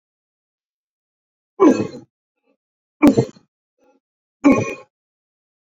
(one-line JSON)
{"three_cough_length": "5.7 s", "three_cough_amplitude": 27966, "three_cough_signal_mean_std_ratio": 0.27, "survey_phase": "beta (2021-08-13 to 2022-03-07)", "age": "45-64", "gender": "Male", "wearing_mask": "No", "symptom_none": true, "symptom_onset": "9 days", "smoker_status": "Never smoked", "respiratory_condition_asthma": false, "respiratory_condition_other": false, "recruitment_source": "REACT", "submission_delay": "1 day", "covid_test_result": "Negative", "covid_test_method": "RT-qPCR", "influenza_a_test_result": "Unknown/Void", "influenza_b_test_result": "Unknown/Void"}